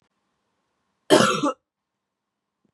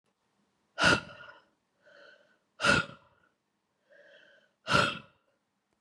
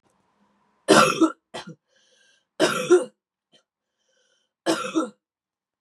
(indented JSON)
{
  "cough_length": "2.7 s",
  "cough_amplitude": 30691,
  "cough_signal_mean_std_ratio": 0.28,
  "exhalation_length": "5.8 s",
  "exhalation_amplitude": 10534,
  "exhalation_signal_mean_std_ratio": 0.29,
  "three_cough_length": "5.8 s",
  "three_cough_amplitude": 25727,
  "three_cough_signal_mean_std_ratio": 0.33,
  "survey_phase": "beta (2021-08-13 to 2022-03-07)",
  "age": "45-64",
  "gender": "Female",
  "wearing_mask": "No",
  "symptom_cough_any": true,
  "symptom_runny_or_blocked_nose": true,
  "symptom_sore_throat": true,
  "symptom_fatigue": true,
  "symptom_headache": true,
  "symptom_onset": "3 days",
  "smoker_status": "Never smoked",
  "respiratory_condition_asthma": false,
  "respiratory_condition_other": false,
  "recruitment_source": "Test and Trace",
  "submission_delay": "1 day",
  "covid_test_result": "Positive",
  "covid_test_method": "RT-qPCR",
  "covid_ct_value": 18.7,
  "covid_ct_gene": "ORF1ab gene",
  "covid_ct_mean": 19.0,
  "covid_viral_load": "570000 copies/ml",
  "covid_viral_load_category": "Low viral load (10K-1M copies/ml)"
}